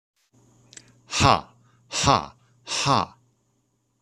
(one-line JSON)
{"exhalation_length": "4.0 s", "exhalation_amplitude": 25140, "exhalation_signal_mean_std_ratio": 0.35, "survey_phase": "beta (2021-08-13 to 2022-03-07)", "age": "45-64", "gender": "Male", "wearing_mask": "No", "symptom_none": true, "smoker_status": "Never smoked", "respiratory_condition_asthma": false, "respiratory_condition_other": false, "recruitment_source": "REACT", "submission_delay": "1 day", "covid_test_result": "Negative", "covid_test_method": "RT-qPCR", "influenza_a_test_result": "Negative", "influenza_b_test_result": "Negative"}